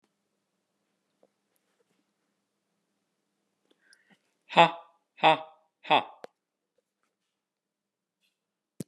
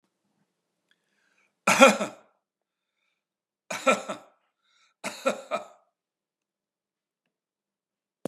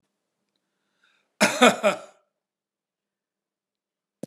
exhalation_length: 8.9 s
exhalation_amplitude: 20467
exhalation_signal_mean_std_ratio: 0.16
three_cough_length: 8.3 s
three_cough_amplitude: 32093
three_cough_signal_mean_std_ratio: 0.21
cough_length: 4.3 s
cough_amplitude: 31150
cough_signal_mean_std_ratio: 0.23
survey_phase: beta (2021-08-13 to 2022-03-07)
age: 65+
gender: Male
wearing_mask: 'No'
symptom_none: true
smoker_status: Never smoked
respiratory_condition_asthma: false
respiratory_condition_other: false
recruitment_source: REACT
submission_delay: 1 day
covid_test_result: Negative
covid_test_method: RT-qPCR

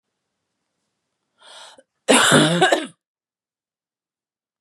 cough_length: 4.6 s
cough_amplitude: 32451
cough_signal_mean_std_ratio: 0.32
survey_phase: beta (2021-08-13 to 2022-03-07)
age: 18-44
gender: Female
wearing_mask: 'No'
symptom_cough_any: true
symptom_new_continuous_cough: true
symptom_runny_or_blocked_nose: true
symptom_sore_throat: true
symptom_fatigue: true
symptom_onset: 3 days
smoker_status: Never smoked
respiratory_condition_asthma: false
respiratory_condition_other: false
recruitment_source: Test and Trace
submission_delay: 1 day
covid_test_result: Positive
covid_test_method: RT-qPCR
covid_ct_value: 30.8
covid_ct_gene: N gene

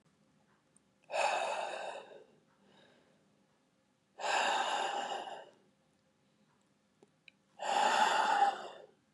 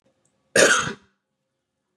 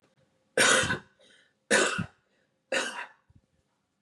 exhalation_length: 9.1 s
exhalation_amplitude: 4537
exhalation_signal_mean_std_ratio: 0.48
cough_length: 2.0 s
cough_amplitude: 28103
cough_signal_mean_std_ratio: 0.32
three_cough_length: 4.0 s
three_cough_amplitude: 13578
three_cough_signal_mean_std_ratio: 0.38
survey_phase: beta (2021-08-13 to 2022-03-07)
age: 18-44
gender: Male
wearing_mask: 'No'
symptom_cough_any: true
symptom_new_continuous_cough: true
symptom_sore_throat: true
symptom_fatigue: true
symptom_onset: 3 days
smoker_status: Never smoked
respiratory_condition_asthma: false
respiratory_condition_other: false
recruitment_source: Test and Trace
submission_delay: 2 days
covid_test_result: Positive
covid_test_method: RT-qPCR
covid_ct_value: 32.9
covid_ct_gene: ORF1ab gene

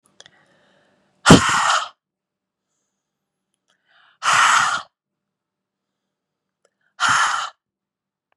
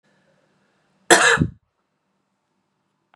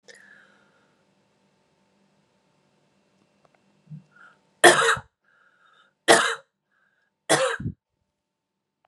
exhalation_length: 8.4 s
exhalation_amplitude: 32768
exhalation_signal_mean_std_ratio: 0.32
cough_length: 3.2 s
cough_amplitude: 32767
cough_signal_mean_std_ratio: 0.25
three_cough_length: 8.9 s
three_cough_amplitude: 32253
three_cough_signal_mean_std_ratio: 0.23
survey_phase: beta (2021-08-13 to 2022-03-07)
age: 18-44
gender: Female
wearing_mask: 'No'
symptom_new_continuous_cough: true
symptom_runny_or_blocked_nose: true
symptom_sore_throat: true
symptom_fatigue: true
symptom_onset: 4 days
smoker_status: Ex-smoker
respiratory_condition_asthma: false
respiratory_condition_other: false
recruitment_source: Test and Trace
submission_delay: 1 day
covid_test_result: Positive
covid_test_method: RT-qPCR
covid_ct_value: 21.0
covid_ct_gene: ORF1ab gene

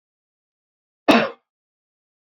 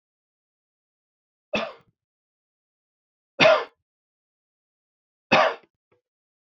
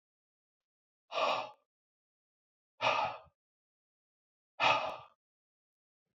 cough_length: 2.4 s
cough_amplitude: 27755
cough_signal_mean_std_ratio: 0.22
three_cough_length: 6.5 s
three_cough_amplitude: 23373
three_cough_signal_mean_std_ratio: 0.22
exhalation_length: 6.1 s
exhalation_amplitude: 5519
exhalation_signal_mean_std_ratio: 0.31
survey_phase: beta (2021-08-13 to 2022-03-07)
age: 65+
gender: Male
wearing_mask: 'No'
symptom_none: true
smoker_status: Never smoked
respiratory_condition_asthma: false
respiratory_condition_other: false
recruitment_source: REACT
submission_delay: 1 day
covid_test_result: Negative
covid_test_method: RT-qPCR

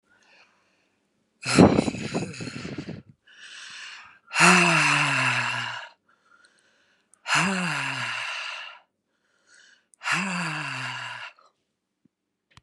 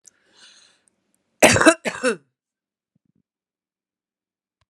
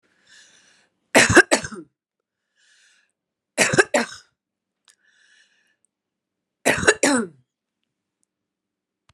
exhalation_length: 12.6 s
exhalation_amplitude: 25801
exhalation_signal_mean_std_ratio: 0.44
cough_length: 4.7 s
cough_amplitude: 32768
cough_signal_mean_std_ratio: 0.23
three_cough_length: 9.1 s
three_cough_amplitude: 32767
three_cough_signal_mean_std_ratio: 0.26
survey_phase: alpha (2021-03-01 to 2021-08-12)
age: 45-64
gender: Female
wearing_mask: 'No'
symptom_none: true
smoker_status: Prefer not to say
respiratory_condition_asthma: false
respiratory_condition_other: false
recruitment_source: REACT
submission_delay: 2 days
covid_test_result: Negative
covid_test_method: RT-qPCR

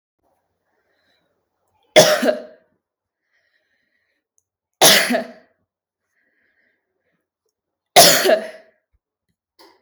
three_cough_length: 9.8 s
three_cough_amplitude: 32768
three_cough_signal_mean_std_ratio: 0.27
survey_phase: beta (2021-08-13 to 2022-03-07)
age: 18-44
gender: Female
wearing_mask: 'No'
symptom_none: true
smoker_status: Never smoked
respiratory_condition_asthma: false
respiratory_condition_other: false
recruitment_source: REACT
submission_delay: 2 days
covid_test_result: Negative
covid_test_method: RT-qPCR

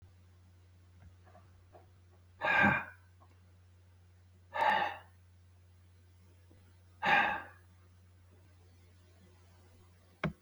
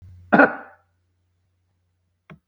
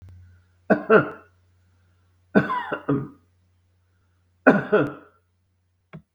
exhalation_length: 10.4 s
exhalation_amplitude: 7087
exhalation_signal_mean_std_ratio: 0.33
cough_length: 2.5 s
cough_amplitude: 32768
cough_signal_mean_std_ratio: 0.22
three_cough_length: 6.1 s
three_cough_amplitude: 32768
three_cough_signal_mean_std_ratio: 0.32
survey_phase: beta (2021-08-13 to 2022-03-07)
age: 65+
gender: Male
wearing_mask: 'No'
symptom_runny_or_blocked_nose: true
smoker_status: Never smoked
respiratory_condition_asthma: false
respiratory_condition_other: false
recruitment_source: Test and Trace
submission_delay: 1 day
covid_test_result: Positive
covid_test_method: ePCR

